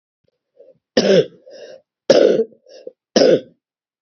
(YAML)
three_cough_length: 4.0 s
three_cough_amplitude: 32768
three_cough_signal_mean_std_ratio: 0.39
survey_phase: beta (2021-08-13 to 2022-03-07)
age: 45-64
gender: Female
wearing_mask: 'No'
symptom_cough_any: true
symptom_runny_or_blocked_nose: true
symptom_fatigue: true
symptom_fever_high_temperature: true
symptom_headache: true
symptom_loss_of_taste: true
symptom_onset: 2 days
smoker_status: Never smoked
respiratory_condition_asthma: false
respiratory_condition_other: false
recruitment_source: Test and Trace
submission_delay: 1 day
covid_test_result: Positive
covid_test_method: RT-qPCR
covid_ct_value: 17.2
covid_ct_gene: ORF1ab gene
covid_ct_mean: 17.5
covid_viral_load: 1800000 copies/ml
covid_viral_load_category: High viral load (>1M copies/ml)